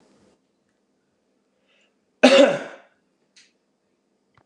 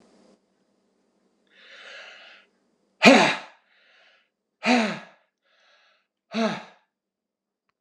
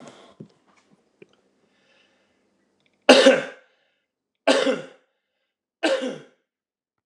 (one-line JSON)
{"cough_length": "4.5 s", "cough_amplitude": 29204, "cough_signal_mean_std_ratio": 0.22, "exhalation_length": "7.8 s", "exhalation_amplitude": 29203, "exhalation_signal_mean_std_ratio": 0.25, "three_cough_length": "7.1 s", "three_cough_amplitude": 29204, "three_cough_signal_mean_std_ratio": 0.26, "survey_phase": "beta (2021-08-13 to 2022-03-07)", "age": "65+", "gender": "Male", "wearing_mask": "No", "symptom_none": true, "smoker_status": "Never smoked", "respiratory_condition_asthma": false, "respiratory_condition_other": false, "recruitment_source": "REACT", "submission_delay": "1 day", "covid_test_result": "Negative", "covid_test_method": "RT-qPCR"}